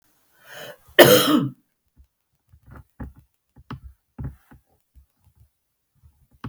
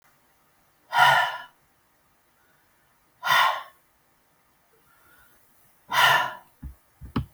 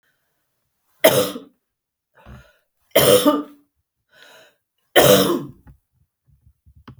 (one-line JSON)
{"cough_length": "6.5 s", "cough_amplitude": 32768, "cough_signal_mean_std_ratio": 0.23, "exhalation_length": "7.3 s", "exhalation_amplitude": 19306, "exhalation_signal_mean_std_ratio": 0.34, "three_cough_length": "7.0 s", "three_cough_amplitude": 32768, "three_cough_signal_mean_std_ratio": 0.33, "survey_phase": "beta (2021-08-13 to 2022-03-07)", "age": "65+", "gender": "Female", "wearing_mask": "No", "symptom_none": true, "smoker_status": "Never smoked", "respiratory_condition_asthma": false, "respiratory_condition_other": false, "recruitment_source": "REACT", "submission_delay": "3 days", "covid_test_result": "Negative", "covid_test_method": "RT-qPCR", "influenza_a_test_result": "Negative", "influenza_b_test_result": "Negative"}